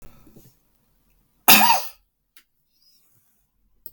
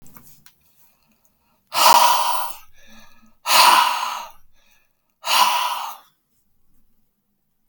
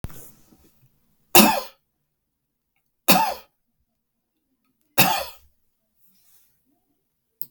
{"cough_length": "3.9 s", "cough_amplitude": 32768, "cough_signal_mean_std_ratio": 0.24, "exhalation_length": "7.7 s", "exhalation_amplitude": 32599, "exhalation_signal_mean_std_ratio": 0.41, "three_cough_length": "7.5 s", "three_cough_amplitude": 32768, "three_cough_signal_mean_std_ratio": 0.24, "survey_phase": "beta (2021-08-13 to 2022-03-07)", "age": "45-64", "gender": "Male", "wearing_mask": "No", "symptom_none": true, "smoker_status": "Ex-smoker", "respiratory_condition_asthma": false, "respiratory_condition_other": true, "recruitment_source": "REACT", "submission_delay": "2 days", "covid_test_result": "Negative", "covid_test_method": "RT-qPCR"}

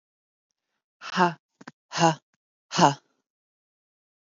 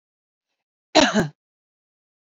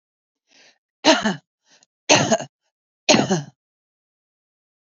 {"exhalation_length": "4.3 s", "exhalation_amplitude": 23770, "exhalation_signal_mean_std_ratio": 0.26, "cough_length": "2.2 s", "cough_amplitude": 29162, "cough_signal_mean_std_ratio": 0.27, "three_cough_length": "4.9 s", "three_cough_amplitude": 29735, "three_cough_signal_mean_std_ratio": 0.32, "survey_phase": "beta (2021-08-13 to 2022-03-07)", "age": "18-44", "gender": "Female", "wearing_mask": "No", "symptom_runny_or_blocked_nose": true, "smoker_status": "Current smoker (1 to 10 cigarettes per day)", "respiratory_condition_asthma": false, "respiratory_condition_other": false, "recruitment_source": "REACT", "submission_delay": "0 days", "covid_test_result": "Negative", "covid_test_method": "RT-qPCR", "influenza_a_test_result": "Negative", "influenza_b_test_result": "Negative"}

